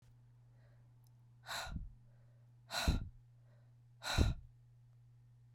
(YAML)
exhalation_length: 5.5 s
exhalation_amplitude: 4378
exhalation_signal_mean_std_ratio: 0.37
survey_phase: beta (2021-08-13 to 2022-03-07)
age: 45-64
gender: Female
wearing_mask: 'No'
symptom_cough_any: true
symptom_runny_or_blocked_nose: true
symptom_onset: 4 days
smoker_status: Never smoked
respiratory_condition_asthma: false
respiratory_condition_other: false
recruitment_source: Test and Trace
submission_delay: 3 days
covid_test_result: Positive
covid_test_method: RT-qPCR
covid_ct_value: 14.8
covid_ct_gene: N gene
covid_ct_mean: 15.1
covid_viral_load: 11000000 copies/ml
covid_viral_load_category: High viral load (>1M copies/ml)